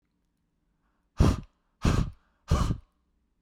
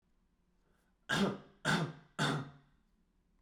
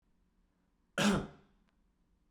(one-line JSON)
{"exhalation_length": "3.4 s", "exhalation_amplitude": 11185, "exhalation_signal_mean_std_ratio": 0.35, "three_cough_length": "3.4 s", "three_cough_amplitude": 3797, "three_cough_signal_mean_std_ratio": 0.42, "cough_length": "2.3 s", "cough_amplitude": 3934, "cough_signal_mean_std_ratio": 0.29, "survey_phase": "beta (2021-08-13 to 2022-03-07)", "age": "18-44", "gender": "Male", "wearing_mask": "No", "symptom_runny_or_blocked_nose": true, "smoker_status": "Never smoked", "respiratory_condition_asthma": false, "respiratory_condition_other": false, "recruitment_source": "REACT", "submission_delay": "1 day", "covid_test_result": "Negative", "covid_test_method": "RT-qPCR", "influenza_a_test_result": "Negative", "influenza_b_test_result": "Negative"}